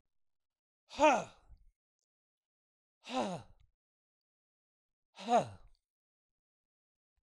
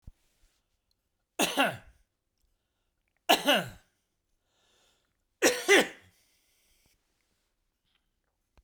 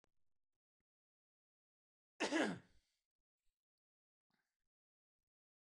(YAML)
exhalation_length: 7.2 s
exhalation_amplitude: 6465
exhalation_signal_mean_std_ratio: 0.23
three_cough_length: 8.6 s
three_cough_amplitude: 14190
three_cough_signal_mean_std_ratio: 0.26
cough_length: 5.7 s
cough_amplitude: 1773
cough_signal_mean_std_ratio: 0.2
survey_phase: beta (2021-08-13 to 2022-03-07)
age: 65+
gender: Male
wearing_mask: 'No'
symptom_none: true
smoker_status: Never smoked
respiratory_condition_asthma: false
respiratory_condition_other: false
recruitment_source: REACT
submission_delay: 1 day
covid_test_result: Negative
covid_test_method: RT-qPCR
influenza_a_test_result: Negative
influenza_b_test_result: Negative